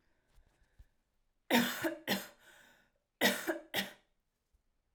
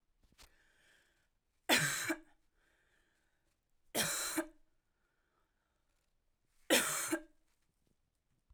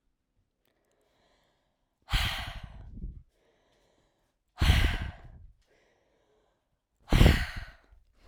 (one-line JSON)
{"cough_length": "4.9 s", "cough_amplitude": 5988, "cough_signal_mean_std_ratio": 0.35, "three_cough_length": "8.5 s", "three_cough_amplitude": 6474, "three_cough_signal_mean_std_ratio": 0.31, "exhalation_length": "8.3 s", "exhalation_amplitude": 14636, "exhalation_signal_mean_std_ratio": 0.3, "survey_phase": "alpha (2021-03-01 to 2021-08-12)", "age": "18-44", "gender": "Female", "wearing_mask": "No", "symptom_cough_any": true, "symptom_shortness_of_breath": true, "symptom_fatigue": true, "symptom_headache": true, "symptom_change_to_sense_of_smell_or_taste": true, "symptom_onset": "2 days", "smoker_status": "Never smoked", "respiratory_condition_asthma": false, "respiratory_condition_other": false, "recruitment_source": "Test and Trace", "submission_delay": "1 day", "covid_test_result": "Positive", "covid_test_method": "RT-qPCR", "covid_ct_value": 31.3, "covid_ct_gene": "ORF1ab gene", "covid_ct_mean": 32.0, "covid_viral_load": "33 copies/ml", "covid_viral_load_category": "Minimal viral load (< 10K copies/ml)"}